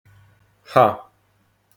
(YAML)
exhalation_length: 1.8 s
exhalation_amplitude: 27591
exhalation_signal_mean_std_ratio: 0.26
survey_phase: alpha (2021-03-01 to 2021-08-12)
age: 45-64
gender: Male
wearing_mask: 'No'
symptom_none: true
smoker_status: Ex-smoker
respiratory_condition_asthma: false
respiratory_condition_other: false
recruitment_source: REACT
submission_delay: 3 days
covid_test_result: Negative
covid_test_method: RT-qPCR